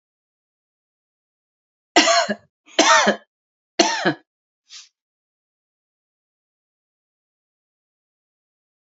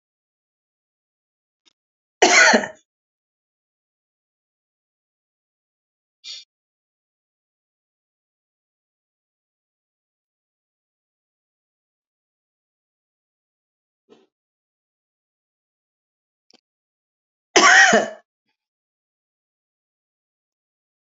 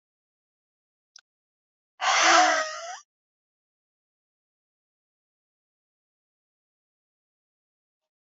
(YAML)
three_cough_length: 9.0 s
three_cough_amplitude: 30708
three_cough_signal_mean_std_ratio: 0.25
cough_length: 21.1 s
cough_amplitude: 28547
cough_signal_mean_std_ratio: 0.16
exhalation_length: 8.3 s
exhalation_amplitude: 15375
exhalation_signal_mean_std_ratio: 0.23
survey_phase: alpha (2021-03-01 to 2021-08-12)
age: 65+
gender: Female
wearing_mask: 'No'
symptom_none: true
smoker_status: Ex-smoker
respiratory_condition_asthma: false
respiratory_condition_other: false
recruitment_source: REACT
submission_delay: 2 days
covid_test_result: Negative
covid_test_method: RT-qPCR
covid_ct_value: 46.0
covid_ct_gene: N gene